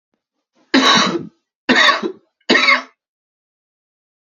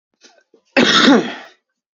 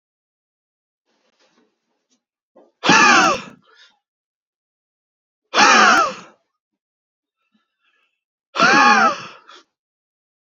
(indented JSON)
{
  "three_cough_length": "4.3 s",
  "three_cough_amplitude": 31670,
  "three_cough_signal_mean_std_ratio": 0.43,
  "cough_length": "2.0 s",
  "cough_amplitude": 32146,
  "cough_signal_mean_std_ratio": 0.44,
  "exhalation_length": "10.6 s",
  "exhalation_amplitude": 32768,
  "exhalation_signal_mean_std_ratio": 0.33,
  "survey_phase": "beta (2021-08-13 to 2022-03-07)",
  "age": "18-44",
  "gender": "Male",
  "wearing_mask": "No",
  "symptom_cough_any": true,
  "symptom_runny_or_blocked_nose": true,
  "symptom_fatigue": true,
  "symptom_headache": true,
  "symptom_change_to_sense_of_smell_or_taste": true,
  "symptom_onset": "5 days",
  "smoker_status": "Never smoked",
  "respiratory_condition_asthma": false,
  "respiratory_condition_other": false,
  "recruitment_source": "Test and Trace",
  "submission_delay": "2 days",
  "covid_test_result": "Positive",
  "covid_test_method": "RT-qPCR"
}